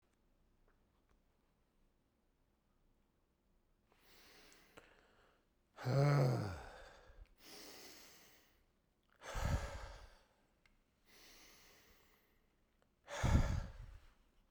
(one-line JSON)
{"exhalation_length": "14.5 s", "exhalation_amplitude": 3148, "exhalation_signal_mean_std_ratio": 0.31, "survey_phase": "beta (2021-08-13 to 2022-03-07)", "age": "65+", "gender": "Male", "wearing_mask": "No", "symptom_none": true, "smoker_status": "Ex-smoker", "respiratory_condition_asthma": false, "respiratory_condition_other": false, "recruitment_source": "REACT", "submission_delay": "2 days", "covid_test_result": "Negative", "covid_test_method": "RT-qPCR"}